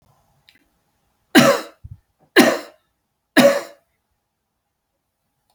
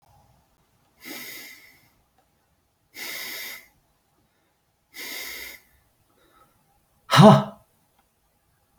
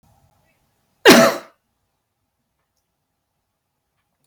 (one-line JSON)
{"three_cough_length": "5.5 s", "three_cough_amplitude": 32768, "three_cough_signal_mean_std_ratio": 0.28, "exhalation_length": "8.8 s", "exhalation_amplitude": 27320, "exhalation_signal_mean_std_ratio": 0.2, "cough_length": "4.3 s", "cough_amplitude": 32768, "cough_signal_mean_std_ratio": 0.21, "survey_phase": "alpha (2021-03-01 to 2021-08-12)", "age": "45-64", "gender": "Male", "wearing_mask": "No", "symptom_none": true, "smoker_status": "Never smoked", "respiratory_condition_asthma": false, "respiratory_condition_other": false, "recruitment_source": "REACT", "submission_delay": "1 day", "covid_test_result": "Negative", "covid_test_method": "RT-qPCR"}